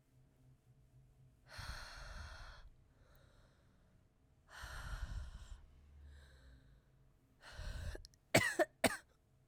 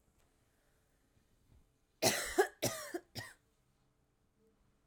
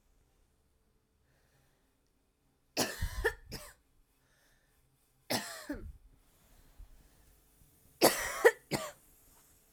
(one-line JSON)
{"exhalation_length": "9.5 s", "exhalation_amplitude": 5691, "exhalation_signal_mean_std_ratio": 0.34, "cough_length": "4.9 s", "cough_amplitude": 5034, "cough_signal_mean_std_ratio": 0.28, "three_cough_length": "9.7 s", "three_cough_amplitude": 11117, "three_cough_signal_mean_std_ratio": 0.26, "survey_phase": "alpha (2021-03-01 to 2021-08-12)", "age": "18-44", "gender": "Female", "wearing_mask": "No", "symptom_cough_any": true, "symptom_new_continuous_cough": true, "symptom_shortness_of_breath": true, "symptom_fatigue": true, "symptom_fever_high_temperature": true, "symptom_headache": true, "symptom_onset": "3 days", "smoker_status": "Never smoked", "respiratory_condition_asthma": false, "respiratory_condition_other": false, "recruitment_source": "Test and Trace", "submission_delay": "2 days", "covid_test_result": "Positive", "covid_test_method": "RT-qPCR"}